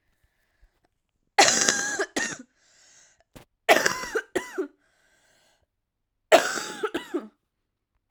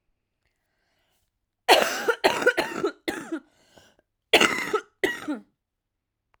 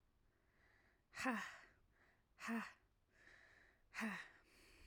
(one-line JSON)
{"three_cough_length": "8.1 s", "three_cough_amplitude": 32767, "three_cough_signal_mean_std_ratio": 0.33, "cough_length": "6.4 s", "cough_amplitude": 30350, "cough_signal_mean_std_ratio": 0.36, "exhalation_length": "4.9 s", "exhalation_amplitude": 1300, "exhalation_signal_mean_std_ratio": 0.42, "survey_phase": "alpha (2021-03-01 to 2021-08-12)", "age": "18-44", "gender": "Female", "wearing_mask": "No", "symptom_cough_any": true, "symptom_new_continuous_cough": true, "symptom_fatigue": true, "symptom_headache": true, "symptom_loss_of_taste": true, "symptom_onset": "4 days", "smoker_status": "Never smoked", "respiratory_condition_asthma": false, "respiratory_condition_other": false, "recruitment_source": "Test and Trace", "submission_delay": "2 days", "covid_test_result": "Positive", "covid_test_method": "RT-qPCR", "covid_ct_value": 15.2, "covid_ct_gene": "ORF1ab gene", "covid_ct_mean": 15.6, "covid_viral_load": "7700000 copies/ml", "covid_viral_load_category": "High viral load (>1M copies/ml)"}